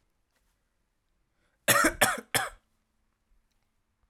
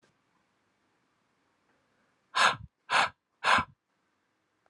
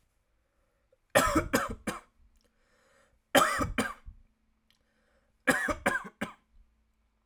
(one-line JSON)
{"cough_length": "4.1 s", "cough_amplitude": 15371, "cough_signal_mean_std_ratio": 0.27, "exhalation_length": "4.7 s", "exhalation_amplitude": 11843, "exhalation_signal_mean_std_ratio": 0.28, "three_cough_length": "7.3 s", "three_cough_amplitude": 12974, "three_cough_signal_mean_std_ratio": 0.35, "survey_phase": "alpha (2021-03-01 to 2021-08-12)", "age": "18-44", "gender": "Male", "wearing_mask": "No", "symptom_none": true, "smoker_status": "Never smoked", "respiratory_condition_asthma": false, "respiratory_condition_other": false, "recruitment_source": "REACT", "submission_delay": "3 days", "covid_test_result": "Negative", "covid_test_method": "RT-qPCR"}